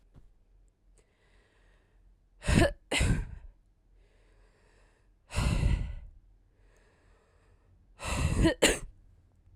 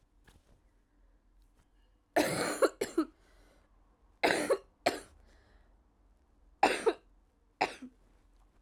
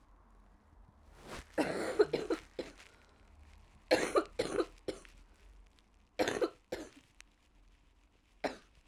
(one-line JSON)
{"exhalation_length": "9.6 s", "exhalation_amplitude": 11378, "exhalation_signal_mean_std_ratio": 0.37, "three_cough_length": "8.6 s", "three_cough_amplitude": 8891, "three_cough_signal_mean_std_ratio": 0.32, "cough_length": "8.9 s", "cough_amplitude": 7553, "cough_signal_mean_std_ratio": 0.37, "survey_phase": "alpha (2021-03-01 to 2021-08-12)", "age": "18-44", "gender": "Female", "wearing_mask": "No", "symptom_cough_any": true, "symptom_new_continuous_cough": true, "symptom_abdominal_pain": true, "symptom_fatigue": true, "symptom_fever_high_temperature": true, "symptom_headache": true, "smoker_status": "Never smoked", "respiratory_condition_asthma": false, "respiratory_condition_other": false, "recruitment_source": "Test and Trace", "submission_delay": "2 days", "covid_test_result": "Positive", "covid_test_method": "LFT"}